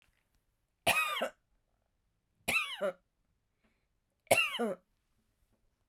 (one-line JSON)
{"three_cough_length": "5.9 s", "three_cough_amplitude": 9172, "three_cough_signal_mean_std_ratio": 0.34, "survey_phase": "beta (2021-08-13 to 2022-03-07)", "age": "65+", "gender": "Female", "wearing_mask": "No", "symptom_none": true, "smoker_status": "Ex-smoker", "respiratory_condition_asthma": false, "respiratory_condition_other": false, "recruitment_source": "Test and Trace", "submission_delay": "2 days", "covid_test_result": "Negative", "covid_test_method": "RT-qPCR"}